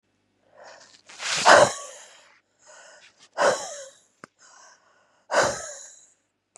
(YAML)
exhalation_length: 6.6 s
exhalation_amplitude: 32758
exhalation_signal_mean_std_ratio: 0.3
survey_phase: beta (2021-08-13 to 2022-03-07)
age: 18-44
gender: Female
wearing_mask: 'No'
symptom_cough_any: true
symptom_new_continuous_cough: true
symptom_runny_or_blocked_nose: true
symptom_shortness_of_breath: true
symptom_sore_throat: true
symptom_fatigue: true
symptom_headache: true
smoker_status: Current smoker (e-cigarettes or vapes only)
respiratory_condition_asthma: false
respiratory_condition_other: false
recruitment_source: Test and Trace
submission_delay: 2 days
covid_test_result: Positive
covid_test_method: LFT